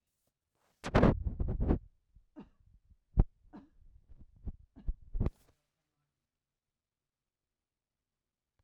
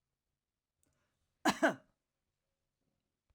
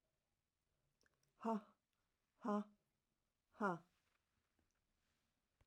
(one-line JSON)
{"three_cough_length": "8.6 s", "three_cough_amplitude": 10090, "three_cough_signal_mean_std_ratio": 0.27, "cough_length": "3.3 s", "cough_amplitude": 4681, "cough_signal_mean_std_ratio": 0.19, "exhalation_length": "5.7 s", "exhalation_amplitude": 1081, "exhalation_signal_mean_std_ratio": 0.25, "survey_phase": "alpha (2021-03-01 to 2021-08-12)", "age": "45-64", "gender": "Female", "wearing_mask": "No", "symptom_none": true, "smoker_status": "Never smoked", "respiratory_condition_asthma": false, "respiratory_condition_other": false, "recruitment_source": "REACT", "submission_delay": "1 day", "covid_test_result": "Negative", "covid_test_method": "RT-qPCR"}